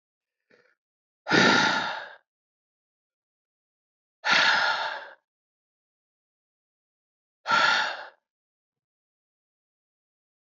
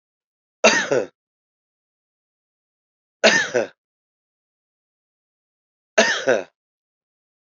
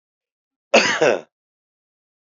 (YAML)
exhalation_length: 10.4 s
exhalation_amplitude: 16770
exhalation_signal_mean_std_ratio: 0.34
three_cough_length: 7.4 s
three_cough_amplitude: 30459
three_cough_signal_mean_std_ratio: 0.28
cough_length: 2.4 s
cough_amplitude: 26358
cough_signal_mean_std_ratio: 0.31
survey_phase: beta (2021-08-13 to 2022-03-07)
age: 45-64
gender: Male
wearing_mask: 'No'
symptom_none: true
smoker_status: Ex-smoker
respiratory_condition_asthma: false
respiratory_condition_other: false
recruitment_source: REACT
submission_delay: 1 day
covid_test_result: Negative
covid_test_method: RT-qPCR